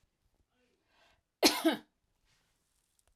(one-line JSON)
{"cough_length": "3.2 s", "cough_amplitude": 11368, "cough_signal_mean_std_ratio": 0.22, "survey_phase": "alpha (2021-03-01 to 2021-08-12)", "age": "45-64", "gender": "Female", "wearing_mask": "No", "symptom_none": true, "smoker_status": "Never smoked", "respiratory_condition_asthma": false, "respiratory_condition_other": false, "recruitment_source": "REACT", "submission_delay": "4 days", "covid_test_result": "Negative", "covid_test_method": "RT-qPCR"}